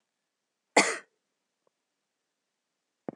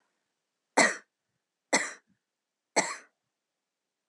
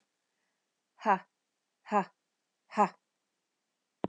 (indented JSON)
{
  "cough_length": "3.2 s",
  "cough_amplitude": 14746,
  "cough_signal_mean_std_ratio": 0.17,
  "three_cough_length": "4.1 s",
  "three_cough_amplitude": 13769,
  "three_cough_signal_mean_std_ratio": 0.24,
  "exhalation_length": "4.1 s",
  "exhalation_amplitude": 7219,
  "exhalation_signal_mean_std_ratio": 0.23,
  "survey_phase": "beta (2021-08-13 to 2022-03-07)",
  "age": "45-64",
  "gender": "Female",
  "wearing_mask": "No",
  "symptom_none": true,
  "smoker_status": "Current smoker (1 to 10 cigarettes per day)",
  "respiratory_condition_asthma": false,
  "respiratory_condition_other": false,
  "recruitment_source": "REACT",
  "submission_delay": "1 day",
  "covid_test_result": "Negative",
  "covid_test_method": "RT-qPCR"
}